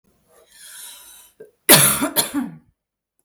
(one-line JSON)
{"cough_length": "3.2 s", "cough_amplitude": 32768, "cough_signal_mean_std_ratio": 0.34, "survey_phase": "beta (2021-08-13 to 2022-03-07)", "age": "18-44", "gender": "Female", "wearing_mask": "No", "symptom_none": true, "smoker_status": "Never smoked", "respiratory_condition_asthma": true, "respiratory_condition_other": false, "recruitment_source": "REACT", "submission_delay": "1 day", "covid_test_result": "Negative", "covid_test_method": "RT-qPCR"}